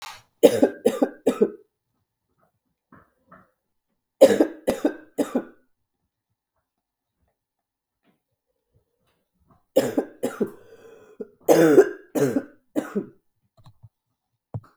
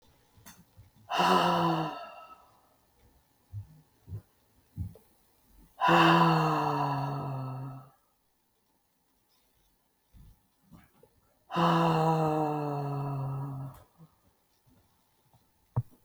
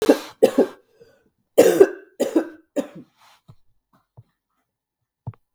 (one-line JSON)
{"three_cough_length": "14.8 s", "three_cough_amplitude": 32768, "three_cough_signal_mean_std_ratio": 0.29, "exhalation_length": "16.0 s", "exhalation_amplitude": 11504, "exhalation_signal_mean_std_ratio": 0.46, "cough_length": "5.5 s", "cough_amplitude": 32768, "cough_signal_mean_std_ratio": 0.29, "survey_phase": "beta (2021-08-13 to 2022-03-07)", "age": "45-64", "gender": "Female", "wearing_mask": "No", "symptom_cough_any": true, "symptom_runny_or_blocked_nose": true, "symptom_shortness_of_breath": true, "symptom_sore_throat": true, "symptom_fatigue": true, "symptom_fever_high_temperature": true, "symptom_headache": true, "symptom_onset": "6 days", "smoker_status": "Never smoked", "respiratory_condition_asthma": false, "respiratory_condition_other": false, "recruitment_source": "Test and Trace", "submission_delay": "3 days", "covid_test_result": "Positive", "covid_test_method": "ePCR"}